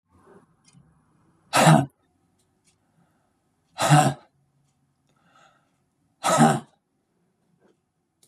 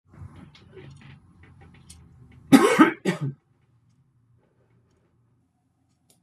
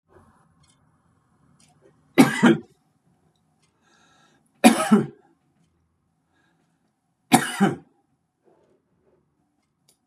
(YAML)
exhalation_length: 8.3 s
exhalation_amplitude: 24225
exhalation_signal_mean_std_ratio: 0.27
cough_length: 6.2 s
cough_amplitude: 27791
cough_signal_mean_std_ratio: 0.24
three_cough_length: 10.1 s
three_cough_amplitude: 32767
three_cough_signal_mean_std_ratio: 0.23
survey_phase: beta (2021-08-13 to 2022-03-07)
age: 65+
gender: Male
wearing_mask: 'No'
symptom_none: true
smoker_status: Ex-smoker
respiratory_condition_asthma: false
respiratory_condition_other: false
recruitment_source: REACT
submission_delay: 1 day
covid_test_result: Negative
covid_test_method: RT-qPCR
influenza_a_test_result: Negative
influenza_b_test_result: Negative